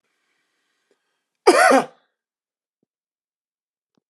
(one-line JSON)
{"cough_length": "4.1 s", "cough_amplitude": 32274, "cough_signal_mean_std_ratio": 0.23, "survey_phase": "alpha (2021-03-01 to 2021-08-12)", "age": "45-64", "gender": "Male", "wearing_mask": "No", "symptom_none": true, "smoker_status": "Never smoked", "respiratory_condition_asthma": false, "respiratory_condition_other": false, "recruitment_source": "REACT", "submission_delay": "1 day", "covid_test_result": "Negative", "covid_test_method": "RT-qPCR"}